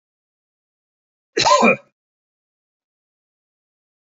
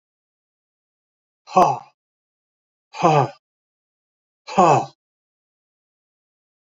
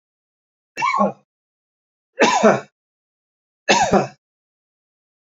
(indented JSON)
{
  "cough_length": "4.0 s",
  "cough_amplitude": 26724,
  "cough_signal_mean_std_ratio": 0.24,
  "exhalation_length": "6.7 s",
  "exhalation_amplitude": 27998,
  "exhalation_signal_mean_std_ratio": 0.26,
  "three_cough_length": "5.3 s",
  "three_cough_amplitude": 30789,
  "three_cough_signal_mean_std_ratio": 0.35,
  "survey_phase": "beta (2021-08-13 to 2022-03-07)",
  "age": "65+",
  "gender": "Male",
  "wearing_mask": "No",
  "symptom_none": true,
  "smoker_status": "Ex-smoker",
  "respiratory_condition_asthma": false,
  "respiratory_condition_other": false,
  "recruitment_source": "REACT",
  "submission_delay": "1 day",
  "covid_test_result": "Negative",
  "covid_test_method": "RT-qPCR",
  "influenza_a_test_result": "Negative",
  "influenza_b_test_result": "Negative"
}